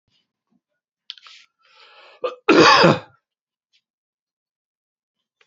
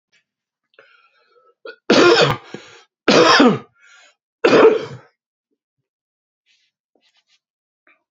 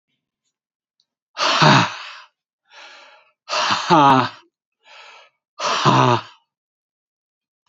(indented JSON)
{
  "cough_length": "5.5 s",
  "cough_amplitude": 29483,
  "cough_signal_mean_std_ratio": 0.26,
  "three_cough_length": "8.1 s",
  "three_cough_amplitude": 31994,
  "three_cough_signal_mean_std_ratio": 0.34,
  "exhalation_length": "7.7 s",
  "exhalation_amplitude": 29508,
  "exhalation_signal_mean_std_ratio": 0.39,
  "survey_phase": "beta (2021-08-13 to 2022-03-07)",
  "age": "65+",
  "gender": "Male",
  "wearing_mask": "No",
  "symptom_cough_any": true,
  "symptom_runny_or_blocked_nose": true,
  "symptom_shortness_of_breath": true,
  "symptom_fatigue": true,
  "symptom_headache": true,
  "symptom_change_to_sense_of_smell_or_taste": true,
  "symptom_loss_of_taste": true,
  "symptom_other": true,
  "symptom_onset": "4 days",
  "smoker_status": "Ex-smoker",
  "respiratory_condition_asthma": false,
  "respiratory_condition_other": false,
  "recruitment_source": "Test and Trace",
  "submission_delay": "2 days",
  "covid_test_result": "Positive",
  "covid_test_method": "RT-qPCR",
  "covid_ct_value": 16.1,
  "covid_ct_gene": "ORF1ab gene"
}